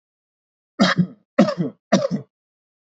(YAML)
three_cough_length: 2.8 s
three_cough_amplitude: 26122
three_cough_signal_mean_std_ratio: 0.39
survey_phase: beta (2021-08-13 to 2022-03-07)
age: 18-44
gender: Male
wearing_mask: 'No'
symptom_cough_any: true
symptom_runny_or_blocked_nose: true
symptom_sore_throat: true
symptom_fatigue: true
smoker_status: Never smoked
respiratory_condition_asthma: false
respiratory_condition_other: false
recruitment_source: Test and Trace
submission_delay: 1 day
covid_test_result: Positive
covid_test_method: RT-qPCR
covid_ct_value: 27.0
covid_ct_gene: N gene